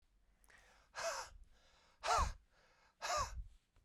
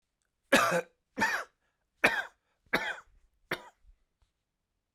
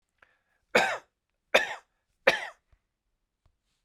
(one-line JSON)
{"exhalation_length": "3.8 s", "exhalation_amplitude": 2466, "exhalation_signal_mean_std_ratio": 0.43, "cough_length": "4.9 s", "cough_amplitude": 11746, "cough_signal_mean_std_ratio": 0.33, "three_cough_length": "3.8 s", "three_cough_amplitude": 23244, "three_cough_signal_mean_std_ratio": 0.26, "survey_phase": "beta (2021-08-13 to 2022-03-07)", "age": "45-64", "gender": "Male", "wearing_mask": "No", "symptom_runny_or_blocked_nose": true, "symptom_shortness_of_breath": true, "symptom_fatigue": true, "symptom_headache": true, "symptom_change_to_sense_of_smell_or_taste": true, "symptom_onset": "3 days", "smoker_status": "Never smoked", "respiratory_condition_asthma": false, "respiratory_condition_other": false, "recruitment_source": "Test and Trace", "submission_delay": "2 days", "covid_test_result": "Positive", "covid_test_method": "RT-qPCR", "covid_ct_value": 17.1, "covid_ct_gene": "ORF1ab gene", "covid_ct_mean": 17.7, "covid_viral_load": "1500000 copies/ml", "covid_viral_load_category": "High viral load (>1M copies/ml)"}